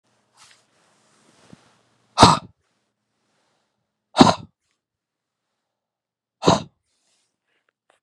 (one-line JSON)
{"exhalation_length": "8.0 s", "exhalation_amplitude": 32768, "exhalation_signal_mean_std_ratio": 0.18, "survey_phase": "beta (2021-08-13 to 2022-03-07)", "age": "45-64", "gender": "Male", "wearing_mask": "No", "symptom_cough_any": true, "symptom_shortness_of_breath": true, "symptom_sore_throat": true, "symptom_fatigue": true, "symptom_headache": true, "smoker_status": "Never smoked", "respiratory_condition_asthma": false, "respiratory_condition_other": false, "recruitment_source": "Test and Trace", "submission_delay": "1 day", "covid_test_result": "Positive", "covid_test_method": "LFT"}